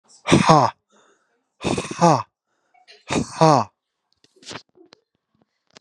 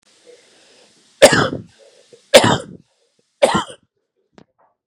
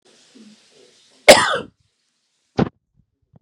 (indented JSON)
{
  "exhalation_length": "5.8 s",
  "exhalation_amplitude": 32767,
  "exhalation_signal_mean_std_ratio": 0.32,
  "three_cough_length": "4.9 s",
  "three_cough_amplitude": 32768,
  "three_cough_signal_mean_std_ratio": 0.29,
  "cough_length": "3.4 s",
  "cough_amplitude": 32768,
  "cough_signal_mean_std_ratio": 0.22,
  "survey_phase": "beta (2021-08-13 to 2022-03-07)",
  "age": "45-64",
  "gender": "Male",
  "wearing_mask": "No",
  "symptom_runny_or_blocked_nose": true,
  "smoker_status": "Never smoked",
  "respiratory_condition_asthma": false,
  "respiratory_condition_other": false,
  "recruitment_source": "Test and Trace",
  "submission_delay": "2 days",
  "covid_test_result": "Positive",
  "covid_test_method": "ePCR"
}